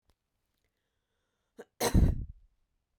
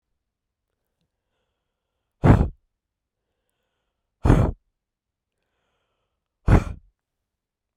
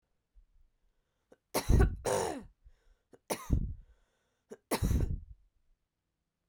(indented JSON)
{
  "cough_length": "3.0 s",
  "cough_amplitude": 7239,
  "cough_signal_mean_std_ratio": 0.27,
  "exhalation_length": "7.8 s",
  "exhalation_amplitude": 32767,
  "exhalation_signal_mean_std_ratio": 0.22,
  "three_cough_length": "6.5 s",
  "three_cough_amplitude": 6924,
  "three_cough_signal_mean_std_ratio": 0.36,
  "survey_phase": "beta (2021-08-13 to 2022-03-07)",
  "age": "18-44",
  "gender": "Female",
  "wearing_mask": "No",
  "symptom_none": true,
  "smoker_status": "Never smoked",
  "respiratory_condition_asthma": false,
  "respiratory_condition_other": false,
  "recruitment_source": "REACT",
  "submission_delay": "3 days",
  "covid_test_result": "Negative",
  "covid_test_method": "RT-qPCR"
}